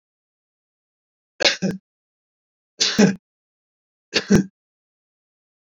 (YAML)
three_cough_length: 5.7 s
three_cough_amplitude: 24929
three_cough_signal_mean_std_ratio: 0.27
survey_phase: beta (2021-08-13 to 2022-03-07)
age: 65+
gender: Male
wearing_mask: 'No'
symptom_none: true
smoker_status: Never smoked
respiratory_condition_asthma: false
respiratory_condition_other: false
recruitment_source: REACT
submission_delay: 1 day
covid_test_result: Negative
covid_test_method: RT-qPCR
influenza_a_test_result: Negative
influenza_b_test_result: Negative